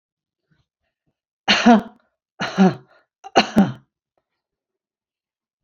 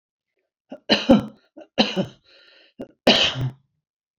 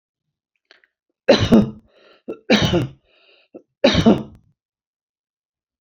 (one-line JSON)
{"exhalation_length": "5.6 s", "exhalation_amplitude": 29572, "exhalation_signal_mean_std_ratio": 0.29, "cough_length": "4.2 s", "cough_amplitude": 30424, "cough_signal_mean_std_ratio": 0.35, "three_cough_length": "5.8 s", "three_cough_amplitude": 28236, "three_cough_signal_mean_std_ratio": 0.34, "survey_phase": "beta (2021-08-13 to 2022-03-07)", "age": "65+", "gender": "Female", "wearing_mask": "No", "symptom_none": true, "smoker_status": "Ex-smoker", "respiratory_condition_asthma": false, "respiratory_condition_other": false, "recruitment_source": "REACT", "submission_delay": "1 day", "covid_test_result": "Negative", "covid_test_method": "RT-qPCR"}